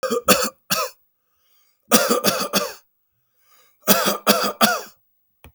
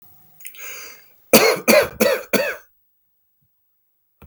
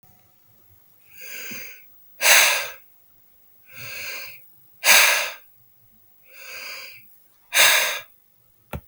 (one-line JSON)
{"three_cough_length": "5.5 s", "three_cough_amplitude": 32766, "three_cough_signal_mean_std_ratio": 0.46, "cough_length": "4.3 s", "cough_amplitude": 32768, "cough_signal_mean_std_ratio": 0.37, "exhalation_length": "8.9 s", "exhalation_amplitude": 32154, "exhalation_signal_mean_std_ratio": 0.36, "survey_phase": "beta (2021-08-13 to 2022-03-07)", "age": "45-64", "gender": "Male", "wearing_mask": "No", "symptom_none": true, "smoker_status": "Never smoked", "respiratory_condition_asthma": false, "respiratory_condition_other": false, "recruitment_source": "REACT", "submission_delay": "1 day", "covid_test_result": "Positive", "covid_test_method": "RT-qPCR", "covid_ct_value": 37.0, "covid_ct_gene": "N gene", "influenza_a_test_result": "Negative", "influenza_b_test_result": "Negative"}